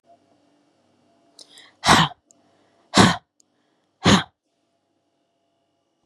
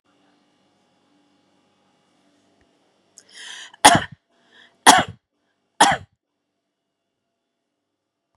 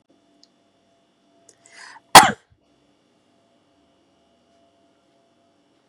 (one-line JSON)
{"exhalation_length": "6.1 s", "exhalation_amplitude": 32711, "exhalation_signal_mean_std_ratio": 0.25, "three_cough_length": "8.4 s", "three_cough_amplitude": 32768, "three_cough_signal_mean_std_ratio": 0.19, "cough_length": "5.9 s", "cough_amplitude": 32768, "cough_signal_mean_std_ratio": 0.12, "survey_phase": "beta (2021-08-13 to 2022-03-07)", "age": "18-44", "gender": "Female", "wearing_mask": "No", "symptom_sore_throat": true, "smoker_status": "Never smoked", "respiratory_condition_asthma": false, "respiratory_condition_other": false, "recruitment_source": "Test and Trace", "submission_delay": "-1 day", "covid_test_result": "Negative", "covid_test_method": "LFT"}